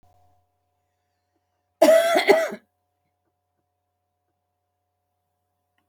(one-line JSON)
{"cough_length": "5.9 s", "cough_amplitude": 26790, "cough_signal_mean_std_ratio": 0.26, "survey_phase": "alpha (2021-03-01 to 2021-08-12)", "age": "65+", "gender": "Female", "wearing_mask": "No", "symptom_none": true, "smoker_status": "Ex-smoker", "respiratory_condition_asthma": false, "respiratory_condition_other": false, "recruitment_source": "REACT", "submission_delay": "1 day", "covid_test_result": "Negative", "covid_test_method": "RT-qPCR"}